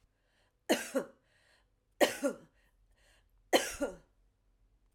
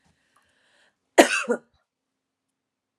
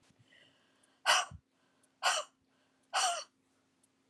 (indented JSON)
{
  "three_cough_length": "4.9 s",
  "three_cough_amplitude": 9859,
  "three_cough_signal_mean_std_ratio": 0.28,
  "cough_length": "3.0 s",
  "cough_amplitude": 32767,
  "cough_signal_mean_std_ratio": 0.2,
  "exhalation_length": "4.1 s",
  "exhalation_amplitude": 6835,
  "exhalation_signal_mean_std_ratio": 0.32,
  "survey_phase": "alpha (2021-03-01 to 2021-08-12)",
  "age": "45-64",
  "gender": "Female",
  "wearing_mask": "No",
  "symptom_none": true,
  "symptom_onset": "8 days",
  "smoker_status": "Ex-smoker",
  "respiratory_condition_asthma": false,
  "respiratory_condition_other": false,
  "recruitment_source": "REACT",
  "submission_delay": "4 days",
  "covid_test_result": "Negative",
  "covid_test_method": "RT-qPCR"
}